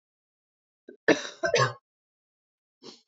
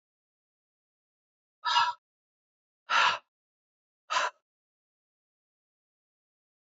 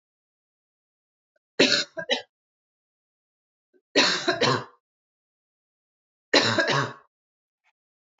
{"cough_length": "3.1 s", "cough_amplitude": 14765, "cough_signal_mean_std_ratio": 0.27, "exhalation_length": "6.7 s", "exhalation_amplitude": 9117, "exhalation_signal_mean_std_ratio": 0.26, "three_cough_length": "8.2 s", "three_cough_amplitude": 22476, "three_cough_signal_mean_std_ratio": 0.33, "survey_phase": "beta (2021-08-13 to 2022-03-07)", "age": "45-64", "gender": "Female", "wearing_mask": "No", "symptom_cough_any": true, "smoker_status": "Never smoked", "respiratory_condition_asthma": false, "respiratory_condition_other": false, "recruitment_source": "Test and Trace", "submission_delay": "2 days", "covid_test_result": "Positive", "covid_test_method": "RT-qPCR", "covid_ct_value": 25.0, "covid_ct_gene": "ORF1ab gene", "covid_ct_mean": 25.5, "covid_viral_load": "4500 copies/ml", "covid_viral_load_category": "Minimal viral load (< 10K copies/ml)"}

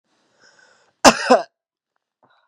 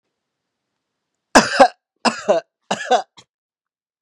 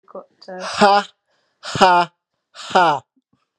{"cough_length": "2.5 s", "cough_amplitude": 32768, "cough_signal_mean_std_ratio": 0.24, "three_cough_length": "4.0 s", "three_cough_amplitude": 32768, "three_cough_signal_mean_std_ratio": 0.3, "exhalation_length": "3.6 s", "exhalation_amplitude": 32767, "exhalation_signal_mean_std_ratio": 0.42, "survey_phase": "beta (2021-08-13 to 2022-03-07)", "age": "18-44", "gender": "Male", "wearing_mask": "No", "symptom_none": true, "smoker_status": "Never smoked", "respiratory_condition_asthma": false, "respiratory_condition_other": false, "recruitment_source": "REACT", "submission_delay": "2 days", "covid_test_result": "Negative", "covid_test_method": "RT-qPCR", "influenza_a_test_result": "Negative", "influenza_b_test_result": "Negative"}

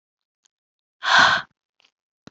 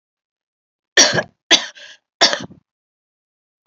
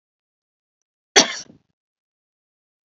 {"exhalation_length": "2.3 s", "exhalation_amplitude": 26176, "exhalation_signal_mean_std_ratio": 0.31, "three_cough_length": "3.7 s", "three_cough_amplitude": 32768, "three_cough_signal_mean_std_ratio": 0.28, "cough_length": "2.9 s", "cough_amplitude": 32768, "cough_signal_mean_std_ratio": 0.16, "survey_phase": "beta (2021-08-13 to 2022-03-07)", "age": "18-44", "gender": "Female", "wearing_mask": "No", "symptom_cough_any": true, "symptom_runny_or_blocked_nose": true, "symptom_shortness_of_breath": true, "symptom_fatigue": true, "symptom_change_to_sense_of_smell_or_taste": true, "symptom_loss_of_taste": true, "symptom_onset": "3 days", "smoker_status": "Never smoked", "respiratory_condition_asthma": false, "respiratory_condition_other": false, "recruitment_source": "Test and Trace", "submission_delay": "2 days", "covid_test_result": "Positive", "covid_test_method": "RT-qPCR", "covid_ct_value": 24.9, "covid_ct_gene": "ORF1ab gene", "covid_ct_mean": 25.3, "covid_viral_load": "4900 copies/ml", "covid_viral_load_category": "Minimal viral load (< 10K copies/ml)"}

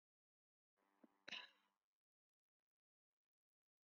{"cough_length": "3.9 s", "cough_amplitude": 407, "cough_signal_mean_std_ratio": 0.18, "survey_phase": "beta (2021-08-13 to 2022-03-07)", "age": "65+", "gender": "Female", "wearing_mask": "No", "symptom_shortness_of_breath": true, "symptom_loss_of_taste": true, "smoker_status": "Ex-smoker", "respiratory_condition_asthma": false, "respiratory_condition_other": true, "recruitment_source": "REACT", "submission_delay": "5 days", "covid_test_result": "Negative", "covid_test_method": "RT-qPCR", "influenza_a_test_result": "Negative", "influenza_b_test_result": "Negative"}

